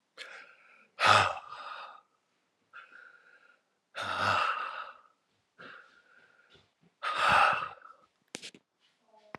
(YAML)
exhalation_length: 9.4 s
exhalation_amplitude: 13973
exhalation_signal_mean_std_ratio: 0.36
survey_phase: alpha (2021-03-01 to 2021-08-12)
age: 45-64
gender: Male
wearing_mask: 'No'
symptom_cough_any: true
symptom_fatigue: true
symptom_headache: true
symptom_onset: 3 days
smoker_status: Never smoked
respiratory_condition_asthma: false
respiratory_condition_other: false
recruitment_source: Test and Trace
submission_delay: 2 days
covid_test_result: Positive
covid_test_method: RT-qPCR
covid_ct_value: 15.8
covid_ct_gene: ORF1ab gene
covid_ct_mean: 16.3
covid_viral_load: 4400000 copies/ml
covid_viral_load_category: High viral load (>1M copies/ml)